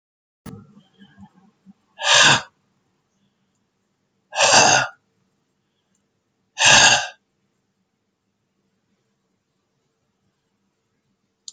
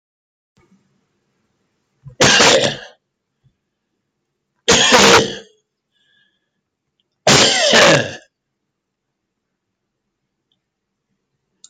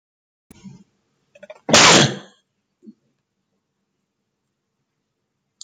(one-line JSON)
{"exhalation_length": "11.5 s", "exhalation_amplitude": 32768, "exhalation_signal_mean_std_ratio": 0.27, "three_cough_length": "11.7 s", "three_cough_amplitude": 32124, "three_cough_signal_mean_std_ratio": 0.34, "cough_length": "5.6 s", "cough_amplitude": 32768, "cough_signal_mean_std_ratio": 0.23, "survey_phase": "beta (2021-08-13 to 2022-03-07)", "age": "65+", "gender": "Male", "wearing_mask": "No", "symptom_none": true, "smoker_status": "Never smoked", "respiratory_condition_asthma": false, "respiratory_condition_other": false, "recruitment_source": "REACT", "submission_delay": "0 days", "covid_test_result": "Negative", "covid_test_method": "RT-qPCR"}